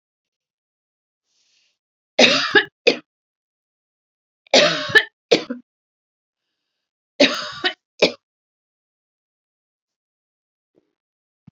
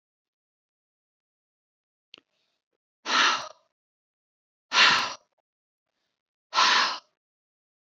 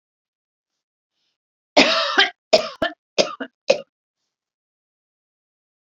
three_cough_length: 11.5 s
three_cough_amplitude: 31475
three_cough_signal_mean_std_ratio: 0.25
exhalation_length: 7.9 s
exhalation_amplitude: 16650
exhalation_signal_mean_std_ratio: 0.29
cough_length: 5.9 s
cough_amplitude: 32244
cough_signal_mean_std_ratio: 0.28
survey_phase: beta (2021-08-13 to 2022-03-07)
age: 65+
gender: Female
wearing_mask: 'No'
symptom_none: true
symptom_onset: 13 days
smoker_status: Never smoked
respiratory_condition_asthma: false
respiratory_condition_other: false
recruitment_source: REACT
submission_delay: 1 day
covid_test_result: Negative
covid_test_method: RT-qPCR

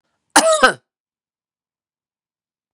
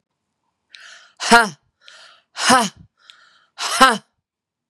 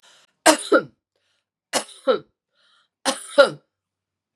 cough_length: 2.7 s
cough_amplitude: 32768
cough_signal_mean_std_ratio: 0.27
exhalation_length: 4.7 s
exhalation_amplitude: 32768
exhalation_signal_mean_std_ratio: 0.31
three_cough_length: 4.4 s
three_cough_amplitude: 32767
three_cough_signal_mean_std_ratio: 0.28
survey_phase: beta (2021-08-13 to 2022-03-07)
age: 45-64
gender: Female
wearing_mask: 'No'
symptom_cough_any: true
symptom_runny_or_blocked_nose: true
symptom_fatigue: true
symptom_onset: 2 days
smoker_status: Never smoked
respiratory_condition_asthma: false
respiratory_condition_other: false
recruitment_source: Test and Trace
submission_delay: 1 day
covid_test_result: Positive
covid_test_method: RT-qPCR
covid_ct_value: 28.4
covid_ct_gene: N gene
covid_ct_mean: 28.5
covid_viral_load: 440 copies/ml
covid_viral_load_category: Minimal viral load (< 10K copies/ml)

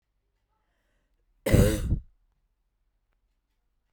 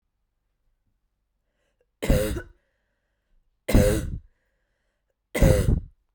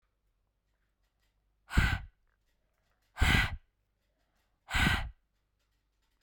cough_length: 3.9 s
cough_amplitude: 15305
cough_signal_mean_std_ratio: 0.26
three_cough_length: 6.1 s
three_cough_amplitude: 20101
three_cough_signal_mean_std_ratio: 0.34
exhalation_length: 6.2 s
exhalation_amplitude: 9927
exhalation_signal_mean_std_ratio: 0.31
survey_phase: beta (2021-08-13 to 2022-03-07)
age: 18-44
gender: Female
wearing_mask: 'No'
symptom_sore_throat: true
symptom_fatigue: true
symptom_headache: true
symptom_onset: 9 days
smoker_status: Current smoker (11 or more cigarettes per day)
respiratory_condition_asthma: false
respiratory_condition_other: false
recruitment_source: REACT
submission_delay: 1 day
covid_test_result: Negative
covid_test_method: RT-qPCR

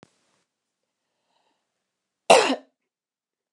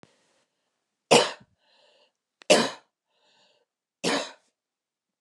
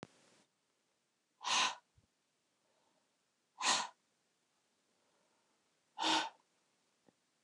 cough_length: 3.5 s
cough_amplitude: 29203
cough_signal_mean_std_ratio: 0.19
three_cough_length: 5.2 s
three_cough_amplitude: 23787
three_cough_signal_mean_std_ratio: 0.24
exhalation_length: 7.4 s
exhalation_amplitude: 3659
exhalation_signal_mean_std_ratio: 0.28
survey_phase: beta (2021-08-13 to 2022-03-07)
age: 45-64
gender: Female
wearing_mask: 'No'
symptom_cough_any: true
symptom_sore_throat: true
symptom_onset: 2 days
smoker_status: Never smoked
respiratory_condition_asthma: false
respiratory_condition_other: false
recruitment_source: Test and Trace
submission_delay: 1 day
covid_test_result: Positive
covid_test_method: RT-qPCR
covid_ct_value: 19.9
covid_ct_gene: ORF1ab gene
covid_ct_mean: 20.5
covid_viral_load: 190000 copies/ml
covid_viral_load_category: Low viral load (10K-1M copies/ml)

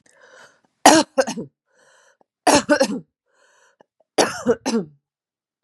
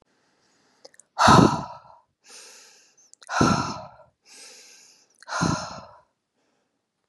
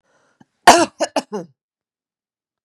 three_cough_length: 5.6 s
three_cough_amplitude: 32768
three_cough_signal_mean_std_ratio: 0.33
exhalation_length: 7.1 s
exhalation_amplitude: 25668
exhalation_signal_mean_std_ratio: 0.3
cough_length: 2.6 s
cough_amplitude: 32768
cough_signal_mean_std_ratio: 0.25
survey_phase: beta (2021-08-13 to 2022-03-07)
age: 45-64
gender: Female
wearing_mask: 'No'
symptom_none: true
smoker_status: Never smoked
respiratory_condition_asthma: false
respiratory_condition_other: false
recruitment_source: REACT
submission_delay: 1 day
covid_test_result: Negative
covid_test_method: RT-qPCR
influenza_a_test_result: Negative
influenza_b_test_result: Negative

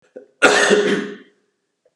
cough_length: 2.0 s
cough_amplitude: 32767
cough_signal_mean_std_ratio: 0.48
survey_phase: beta (2021-08-13 to 2022-03-07)
age: 45-64
gender: Male
wearing_mask: 'No'
symptom_cough_any: true
symptom_runny_or_blocked_nose: true
symptom_sore_throat: true
symptom_onset: 2 days
smoker_status: Never smoked
respiratory_condition_asthma: false
respiratory_condition_other: false
recruitment_source: Test and Trace
submission_delay: 1 day
covid_test_result: Positive
covid_test_method: RT-qPCR
covid_ct_value: 20.1
covid_ct_gene: ORF1ab gene
covid_ct_mean: 20.2
covid_viral_load: 240000 copies/ml
covid_viral_load_category: Low viral load (10K-1M copies/ml)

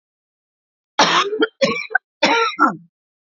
three_cough_length: 3.2 s
three_cough_amplitude: 30503
three_cough_signal_mean_std_ratio: 0.49
survey_phase: alpha (2021-03-01 to 2021-08-12)
age: 45-64
gender: Female
wearing_mask: 'No'
symptom_cough_any: true
symptom_fatigue: true
symptom_headache: true
symptom_onset: 4 days
smoker_status: Ex-smoker
respiratory_condition_asthma: false
respiratory_condition_other: false
recruitment_source: Test and Trace
submission_delay: 2 days
covid_test_result: Positive
covid_test_method: RT-qPCR
covid_ct_value: 27.8
covid_ct_gene: ORF1ab gene
covid_ct_mean: 27.9
covid_viral_load: 720 copies/ml
covid_viral_load_category: Minimal viral load (< 10K copies/ml)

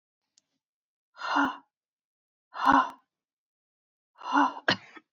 exhalation_length: 5.1 s
exhalation_amplitude: 15931
exhalation_signal_mean_std_ratio: 0.32
survey_phase: beta (2021-08-13 to 2022-03-07)
age: 18-44
gender: Female
wearing_mask: 'No'
symptom_cough_any: true
symptom_new_continuous_cough: true
symptom_runny_or_blocked_nose: true
symptom_shortness_of_breath: true
symptom_sore_throat: true
symptom_diarrhoea: true
symptom_fatigue: true
symptom_headache: true
symptom_onset: 4 days
smoker_status: Never smoked
respiratory_condition_asthma: false
respiratory_condition_other: false
recruitment_source: Test and Trace
submission_delay: 1 day
covid_test_result: Positive
covid_test_method: RT-qPCR
covid_ct_value: 13.8
covid_ct_gene: ORF1ab gene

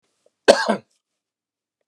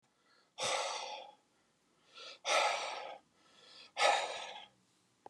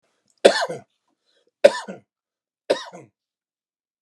cough_length: 1.9 s
cough_amplitude: 32768
cough_signal_mean_std_ratio: 0.24
exhalation_length: 5.3 s
exhalation_amplitude: 4834
exhalation_signal_mean_std_ratio: 0.45
three_cough_length: 4.0 s
three_cough_amplitude: 32768
three_cough_signal_mean_std_ratio: 0.21
survey_phase: beta (2021-08-13 to 2022-03-07)
age: 65+
gender: Male
wearing_mask: 'No'
symptom_none: true
smoker_status: Ex-smoker
respiratory_condition_asthma: false
respiratory_condition_other: false
recruitment_source: REACT
submission_delay: 6 days
covid_test_result: Negative
covid_test_method: RT-qPCR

